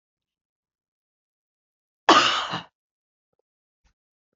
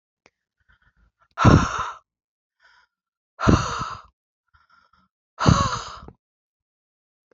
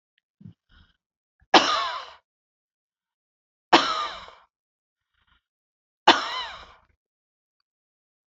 {"cough_length": "4.4 s", "cough_amplitude": 27264, "cough_signal_mean_std_ratio": 0.22, "exhalation_length": "7.3 s", "exhalation_amplitude": 31479, "exhalation_signal_mean_std_ratio": 0.29, "three_cough_length": "8.3 s", "three_cough_amplitude": 29572, "three_cough_signal_mean_std_ratio": 0.24, "survey_phase": "beta (2021-08-13 to 2022-03-07)", "age": "45-64", "gender": "Female", "wearing_mask": "No", "symptom_none": true, "smoker_status": "Never smoked", "respiratory_condition_asthma": false, "respiratory_condition_other": false, "recruitment_source": "REACT", "submission_delay": "3 days", "covid_test_result": "Negative", "covid_test_method": "RT-qPCR"}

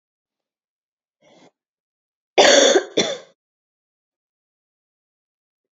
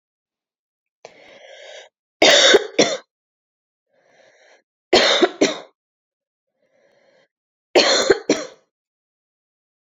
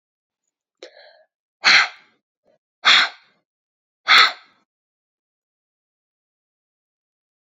{"cough_length": "5.7 s", "cough_amplitude": 29534, "cough_signal_mean_std_ratio": 0.25, "three_cough_length": "9.8 s", "three_cough_amplitude": 31280, "three_cough_signal_mean_std_ratio": 0.32, "exhalation_length": "7.4 s", "exhalation_amplitude": 31450, "exhalation_signal_mean_std_ratio": 0.24, "survey_phase": "beta (2021-08-13 to 2022-03-07)", "age": "18-44", "gender": "Female", "wearing_mask": "No", "symptom_cough_any": true, "symptom_runny_or_blocked_nose": true, "symptom_sore_throat": true, "symptom_loss_of_taste": true, "symptom_onset": "5 days", "smoker_status": "Never smoked", "respiratory_condition_asthma": false, "respiratory_condition_other": false, "recruitment_source": "Test and Trace", "submission_delay": "1 day", "covid_test_result": "Positive", "covid_test_method": "RT-qPCR", "covid_ct_value": 16.0, "covid_ct_gene": "ORF1ab gene", "covid_ct_mean": 16.4, "covid_viral_load": "4200000 copies/ml", "covid_viral_load_category": "High viral load (>1M copies/ml)"}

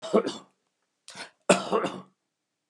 {"cough_length": "2.7 s", "cough_amplitude": 21609, "cough_signal_mean_std_ratio": 0.34, "survey_phase": "beta (2021-08-13 to 2022-03-07)", "age": "65+", "gender": "Male", "wearing_mask": "No", "symptom_none": true, "smoker_status": "Ex-smoker", "respiratory_condition_asthma": false, "respiratory_condition_other": true, "recruitment_source": "REACT", "submission_delay": "0 days", "covid_test_result": "Negative", "covid_test_method": "RT-qPCR", "influenza_a_test_result": "Negative", "influenza_b_test_result": "Negative"}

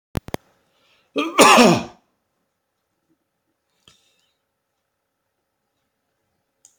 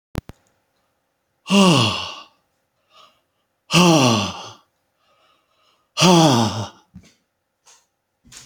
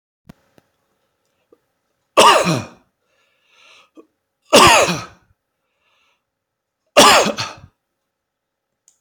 {"cough_length": "6.8 s", "cough_amplitude": 30841, "cough_signal_mean_std_ratio": 0.22, "exhalation_length": "8.5 s", "exhalation_amplitude": 31473, "exhalation_signal_mean_std_ratio": 0.36, "three_cough_length": "9.0 s", "three_cough_amplitude": 32768, "three_cough_signal_mean_std_ratio": 0.3, "survey_phase": "beta (2021-08-13 to 2022-03-07)", "age": "65+", "gender": "Male", "wearing_mask": "No", "symptom_runny_or_blocked_nose": true, "symptom_other": true, "smoker_status": "Never smoked", "respiratory_condition_asthma": false, "respiratory_condition_other": false, "recruitment_source": "Test and Trace", "submission_delay": "1 day", "covid_test_result": "Positive", "covid_test_method": "RT-qPCR", "covid_ct_value": 17.9, "covid_ct_gene": "N gene", "covid_ct_mean": 18.0, "covid_viral_load": "1200000 copies/ml", "covid_viral_load_category": "High viral load (>1M copies/ml)"}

